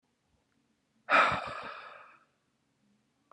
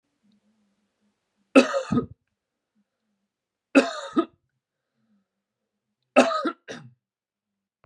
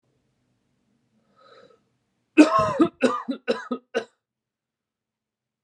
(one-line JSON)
{"exhalation_length": "3.3 s", "exhalation_amplitude": 8090, "exhalation_signal_mean_std_ratio": 0.29, "three_cough_length": "7.9 s", "three_cough_amplitude": 28401, "three_cough_signal_mean_std_ratio": 0.24, "cough_length": "5.6 s", "cough_amplitude": 28819, "cough_signal_mean_std_ratio": 0.28, "survey_phase": "beta (2021-08-13 to 2022-03-07)", "age": "18-44", "gender": "Male", "wearing_mask": "No", "symptom_sore_throat": true, "smoker_status": "Ex-smoker", "respiratory_condition_asthma": false, "respiratory_condition_other": false, "recruitment_source": "REACT", "submission_delay": "2 days", "covid_test_result": "Negative", "covid_test_method": "RT-qPCR", "influenza_a_test_result": "Negative", "influenza_b_test_result": "Negative"}